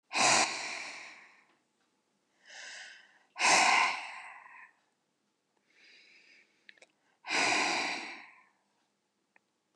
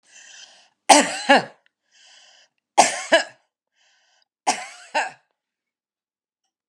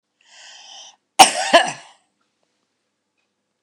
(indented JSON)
{
  "exhalation_length": "9.8 s",
  "exhalation_amplitude": 8400,
  "exhalation_signal_mean_std_ratio": 0.39,
  "three_cough_length": "6.7 s",
  "three_cough_amplitude": 32768,
  "three_cough_signal_mean_std_ratio": 0.27,
  "cough_length": "3.6 s",
  "cough_amplitude": 32768,
  "cough_signal_mean_std_ratio": 0.23,
  "survey_phase": "beta (2021-08-13 to 2022-03-07)",
  "age": "45-64",
  "gender": "Female",
  "wearing_mask": "No",
  "symptom_none": true,
  "smoker_status": "Ex-smoker",
  "respiratory_condition_asthma": false,
  "respiratory_condition_other": false,
  "recruitment_source": "REACT",
  "submission_delay": "2 days",
  "covid_test_result": "Negative",
  "covid_test_method": "RT-qPCR",
  "influenza_a_test_result": "Negative",
  "influenza_b_test_result": "Negative"
}